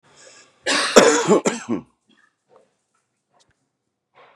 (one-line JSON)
{"cough_length": "4.4 s", "cough_amplitude": 32768, "cough_signal_mean_std_ratio": 0.33, "survey_phase": "beta (2021-08-13 to 2022-03-07)", "age": "45-64", "gender": "Male", "wearing_mask": "No", "symptom_cough_any": true, "symptom_runny_or_blocked_nose": true, "symptom_shortness_of_breath": true, "symptom_sore_throat": true, "symptom_abdominal_pain": true, "symptom_fatigue": true, "symptom_onset": "5 days", "smoker_status": "Never smoked", "respiratory_condition_asthma": false, "respiratory_condition_other": false, "recruitment_source": "REACT", "submission_delay": "5 days", "covid_test_result": "Positive", "covid_test_method": "RT-qPCR", "covid_ct_value": 27.6, "covid_ct_gene": "E gene", "influenza_a_test_result": "Negative", "influenza_b_test_result": "Negative"}